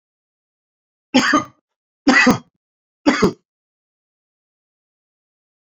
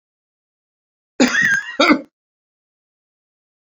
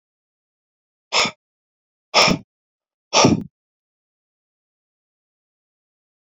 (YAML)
three_cough_length: 5.6 s
three_cough_amplitude: 29519
three_cough_signal_mean_std_ratio: 0.3
cough_length: 3.8 s
cough_amplitude: 29277
cough_signal_mean_std_ratio: 0.33
exhalation_length: 6.4 s
exhalation_amplitude: 32768
exhalation_signal_mean_std_ratio: 0.25
survey_phase: beta (2021-08-13 to 2022-03-07)
age: 45-64
gender: Male
wearing_mask: 'No'
symptom_cough_any: true
symptom_runny_or_blocked_nose: true
symptom_headache: true
symptom_onset: 4 days
smoker_status: Never smoked
respiratory_condition_asthma: false
respiratory_condition_other: false
recruitment_source: Test and Trace
submission_delay: 1 day
covid_test_result: Positive
covid_test_method: RT-qPCR
covid_ct_value: 20.5
covid_ct_gene: N gene